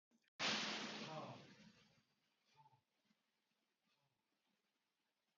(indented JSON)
{
  "exhalation_length": "5.4 s",
  "exhalation_amplitude": 1152,
  "exhalation_signal_mean_std_ratio": 0.35,
  "survey_phase": "beta (2021-08-13 to 2022-03-07)",
  "age": "45-64",
  "gender": "Male",
  "wearing_mask": "No",
  "symptom_runny_or_blocked_nose": true,
  "symptom_shortness_of_breath": true,
  "symptom_fatigue": true,
  "symptom_headache": true,
  "symptom_other": true,
  "smoker_status": "Never smoked",
  "respiratory_condition_asthma": true,
  "respiratory_condition_other": false,
  "recruitment_source": "Test and Trace",
  "submission_delay": "1 day",
  "covid_test_result": "Positive",
  "covid_test_method": "RT-qPCR",
  "covid_ct_value": 21.6,
  "covid_ct_gene": "ORF1ab gene"
}